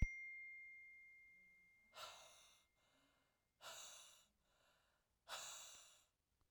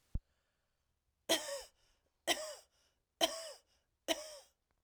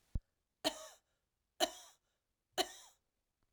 exhalation_length: 6.5 s
exhalation_amplitude: 2050
exhalation_signal_mean_std_ratio: 0.36
cough_length: 4.8 s
cough_amplitude: 4767
cough_signal_mean_std_ratio: 0.31
three_cough_length: 3.5 s
three_cough_amplitude: 4675
three_cough_signal_mean_std_ratio: 0.24
survey_phase: alpha (2021-03-01 to 2021-08-12)
age: 45-64
gender: Female
wearing_mask: 'No'
symptom_cough_any: true
symptom_diarrhoea: true
symptom_fatigue: true
symptom_headache: true
symptom_change_to_sense_of_smell_or_taste: true
symptom_loss_of_taste: true
symptom_onset: 5 days
smoker_status: Ex-smoker
respiratory_condition_asthma: false
respiratory_condition_other: false
recruitment_source: Test and Trace
submission_delay: 2 days
covid_test_result: Positive
covid_test_method: RT-qPCR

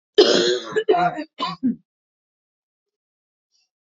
cough_length: 3.9 s
cough_amplitude: 26907
cough_signal_mean_std_ratio: 0.4
survey_phase: beta (2021-08-13 to 2022-03-07)
age: 18-44
gender: Female
wearing_mask: 'No'
symptom_cough_any: true
symptom_runny_or_blocked_nose: true
symptom_sore_throat: true
symptom_fatigue: true
symptom_headache: true
symptom_other: true
symptom_onset: 7 days
smoker_status: Never smoked
respiratory_condition_asthma: false
respiratory_condition_other: false
recruitment_source: Test and Trace
submission_delay: 2 days
covid_test_result: Positive
covid_test_method: RT-qPCR
covid_ct_value: 19.8
covid_ct_gene: N gene
covid_ct_mean: 20.3
covid_viral_load: 220000 copies/ml
covid_viral_load_category: Low viral load (10K-1M copies/ml)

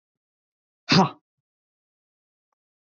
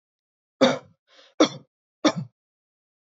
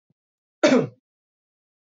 exhalation_length: 2.8 s
exhalation_amplitude: 17652
exhalation_signal_mean_std_ratio: 0.21
three_cough_length: 3.2 s
three_cough_amplitude: 24111
three_cough_signal_mean_std_ratio: 0.26
cough_length: 2.0 s
cough_amplitude: 22546
cough_signal_mean_std_ratio: 0.27
survey_phase: beta (2021-08-13 to 2022-03-07)
age: 18-44
gender: Male
wearing_mask: 'No'
symptom_none: true
smoker_status: Never smoked
respiratory_condition_asthma: false
respiratory_condition_other: false
recruitment_source: Test and Trace
submission_delay: -1 day
covid_test_result: Negative
covid_test_method: LFT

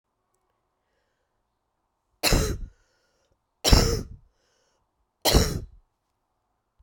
three_cough_length: 6.8 s
three_cough_amplitude: 28018
three_cough_signal_mean_std_ratio: 0.29
survey_phase: beta (2021-08-13 to 2022-03-07)
age: 45-64
gender: Female
wearing_mask: 'No'
symptom_cough_any: true
symptom_new_continuous_cough: true
symptom_runny_or_blocked_nose: true
symptom_shortness_of_breath: true
symptom_sore_throat: true
symptom_headache: true
symptom_onset: 3 days
smoker_status: Never smoked
respiratory_condition_asthma: false
respiratory_condition_other: false
recruitment_source: Test and Trace
submission_delay: 1 day
covid_test_result: Positive
covid_test_method: RT-qPCR
covid_ct_value: 23.1
covid_ct_gene: ORF1ab gene
covid_ct_mean: 23.9
covid_viral_load: 15000 copies/ml
covid_viral_load_category: Low viral load (10K-1M copies/ml)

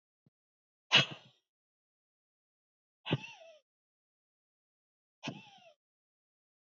exhalation_length: 6.7 s
exhalation_amplitude: 8177
exhalation_signal_mean_std_ratio: 0.16
survey_phase: beta (2021-08-13 to 2022-03-07)
age: 18-44
gender: Female
wearing_mask: 'No'
symptom_cough_any: true
symptom_shortness_of_breath: true
symptom_sore_throat: true
symptom_abdominal_pain: true
symptom_diarrhoea: true
symptom_fatigue: true
symptom_headache: true
symptom_onset: 4 days
smoker_status: Never smoked
respiratory_condition_asthma: false
respiratory_condition_other: false
recruitment_source: Test and Trace
submission_delay: 2 days
covid_test_result: Positive
covid_test_method: RT-qPCR
covid_ct_value: 26.6
covid_ct_gene: ORF1ab gene
covid_ct_mean: 27.0
covid_viral_load: 1400 copies/ml
covid_viral_load_category: Minimal viral load (< 10K copies/ml)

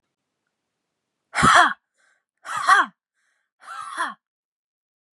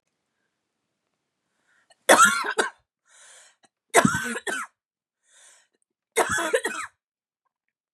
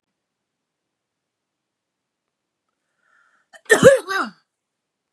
exhalation_length: 5.1 s
exhalation_amplitude: 28079
exhalation_signal_mean_std_ratio: 0.3
three_cough_length: 7.9 s
three_cough_amplitude: 30238
three_cough_signal_mean_std_ratio: 0.31
cough_length: 5.1 s
cough_amplitude: 32768
cough_signal_mean_std_ratio: 0.2
survey_phase: beta (2021-08-13 to 2022-03-07)
age: 45-64
gender: Female
wearing_mask: 'No'
symptom_none: true
smoker_status: Ex-smoker
respiratory_condition_asthma: true
respiratory_condition_other: false
recruitment_source: REACT
submission_delay: 1 day
covid_test_result: Negative
covid_test_method: RT-qPCR
influenza_a_test_result: Negative
influenza_b_test_result: Negative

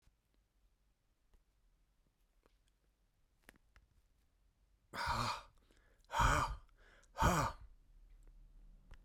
exhalation_length: 9.0 s
exhalation_amplitude: 4244
exhalation_signal_mean_std_ratio: 0.32
survey_phase: beta (2021-08-13 to 2022-03-07)
age: 65+
gender: Male
wearing_mask: 'No'
symptom_none: true
smoker_status: Never smoked
respiratory_condition_asthma: false
respiratory_condition_other: false
recruitment_source: REACT
submission_delay: 2 days
covid_test_result: Negative
covid_test_method: RT-qPCR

